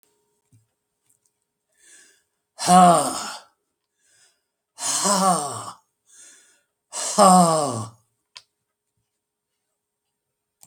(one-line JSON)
{"exhalation_length": "10.7 s", "exhalation_amplitude": 31298, "exhalation_signal_mean_std_ratio": 0.32, "survey_phase": "alpha (2021-03-01 to 2021-08-12)", "age": "65+", "gender": "Male", "wearing_mask": "No", "symptom_none": true, "smoker_status": "Ex-smoker", "respiratory_condition_asthma": false, "respiratory_condition_other": false, "recruitment_source": "REACT", "submission_delay": "1 day", "covid_test_result": "Negative", "covid_test_method": "RT-qPCR"}